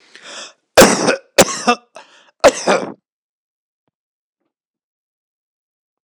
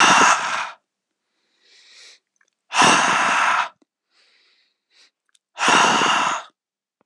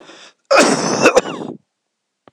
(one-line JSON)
{"three_cough_length": "6.0 s", "three_cough_amplitude": 26028, "three_cough_signal_mean_std_ratio": 0.3, "exhalation_length": "7.1 s", "exhalation_amplitude": 25899, "exhalation_signal_mean_std_ratio": 0.48, "cough_length": "2.3 s", "cough_amplitude": 26028, "cough_signal_mean_std_ratio": 0.47, "survey_phase": "beta (2021-08-13 to 2022-03-07)", "age": "45-64", "gender": "Male", "wearing_mask": "No", "symptom_none": true, "smoker_status": "Ex-smoker", "respiratory_condition_asthma": false, "respiratory_condition_other": false, "recruitment_source": "REACT", "submission_delay": "3 days", "covid_test_result": "Negative", "covid_test_method": "RT-qPCR"}